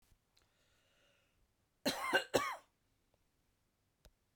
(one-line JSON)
{"cough_length": "4.4 s", "cough_amplitude": 4721, "cough_signal_mean_std_ratio": 0.27, "survey_phase": "beta (2021-08-13 to 2022-03-07)", "age": "65+", "gender": "Female", "wearing_mask": "No", "symptom_none": true, "smoker_status": "Ex-smoker", "respiratory_condition_asthma": false, "respiratory_condition_other": false, "recruitment_source": "REACT", "submission_delay": "1 day", "covid_test_result": "Negative", "covid_test_method": "RT-qPCR", "influenza_a_test_result": "Negative", "influenza_b_test_result": "Negative"}